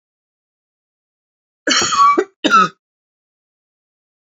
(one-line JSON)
{"cough_length": "4.3 s", "cough_amplitude": 29536, "cough_signal_mean_std_ratio": 0.35, "survey_phase": "beta (2021-08-13 to 2022-03-07)", "age": "45-64", "gender": "Female", "wearing_mask": "No", "symptom_cough_any": true, "symptom_new_continuous_cough": true, "symptom_fatigue": true, "symptom_change_to_sense_of_smell_or_taste": true, "symptom_loss_of_taste": true, "smoker_status": "Ex-smoker", "respiratory_condition_asthma": false, "respiratory_condition_other": false, "recruitment_source": "Test and Trace", "submission_delay": "2 days", "covid_test_result": "Positive", "covid_test_method": "RT-qPCR", "covid_ct_value": 22.2, "covid_ct_gene": "ORF1ab gene"}